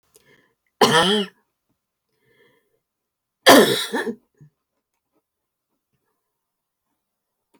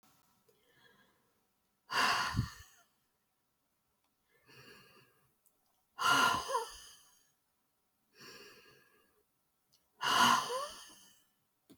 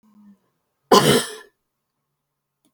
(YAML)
cough_length: 7.6 s
cough_amplitude: 31903
cough_signal_mean_std_ratio: 0.25
exhalation_length: 11.8 s
exhalation_amplitude: 6122
exhalation_signal_mean_std_ratio: 0.32
three_cough_length: 2.7 s
three_cough_amplitude: 31066
three_cough_signal_mean_std_ratio: 0.27
survey_phase: alpha (2021-03-01 to 2021-08-12)
age: 65+
gender: Female
wearing_mask: 'No'
symptom_none: true
smoker_status: Ex-smoker
respiratory_condition_asthma: false
respiratory_condition_other: false
recruitment_source: REACT
submission_delay: 3 days
covid_test_result: Negative
covid_test_method: RT-qPCR